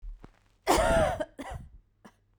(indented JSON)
{
  "cough_length": "2.4 s",
  "cough_amplitude": 11667,
  "cough_signal_mean_std_ratio": 0.47,
  "survey_phase": "beta (2021-08-13 to 2022-03-07)",
  "age": "45-64",
  "gender": "Female",
  "wearing_mask": "No",
  "symptom_none": true,
  "smoker_status": "Never smoked",
  "respiratory_condition_asthma": false,
  "respiratory_condition_other": false,
  "recruitment_source": "REACT",
  "submission_delay": "2 days",
  "covid_test_result": "Negative",
  "covid_test_method": "RT-qPCR"
}